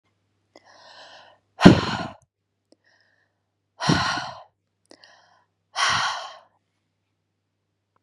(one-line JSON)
{"exhalation_length": "8.0 s", "exhalation_amplitude": 32768, "exhalation_signal_mean_std_ratio": 0.25, "survey_phase": "beta (2021-08-13 to 2022-03-07)", "age": "45-64", "gender": "Female", "wearing_mask": "No", "symptom_runny_or_blocked_nose": true, "symptom_onset": "13 days", "smoker_status": "Never smoked", "respiratory_condition_asthma": false, "respiratory_condition_other": false, "recruitment_source": "REACT", "submission_delay": "6 days", "covid_test_result": "Negative", "covid_test_method": "RT-qPCR", "influenza_a_test_result": "Negative", "influenza_b_test_result": "Negative"}